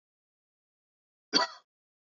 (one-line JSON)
{"cough_length": "2.1 s", "cough_amplitude": 9321, "cough_signal_mean_std_ratio": 0.19, "survey_phase": "beta (2021-08-13 to 2022-03-07)", "age": "18-44", "gender": "Male", "wearing_mask": "No", "symptom_cough_any": true, "smoker_status": "Never smoked", "respiratory_condition_asthma": false, "respiratory_condition_other": false, "recruitment_source": "Test and Trace", "submission_delay": "1 day", "covid_test_result": "Positive", "covid_test_method": "ePCR"}